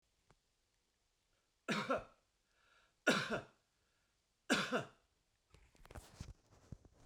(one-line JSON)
{"three_cough_length": "7.1 s", "three_cough_amplitude": 3994, "three_cough_signal_mean_std_ratio": 0.31, "survey_phase": "beta (2021-08-13 to 2022-03-07)", "age": "65+", "gender": "Male", "wearing_mask": "No", "symptom_none": true, "smoker_status": "Never smoked", "respiratory_condition_asthma": false, "respiratory_condition_other": false, "recruitment_source": "REACT", "submission_delay": "1 day", "covid_test_result": "Negative", "covid_test_method": "RT-qPCR"}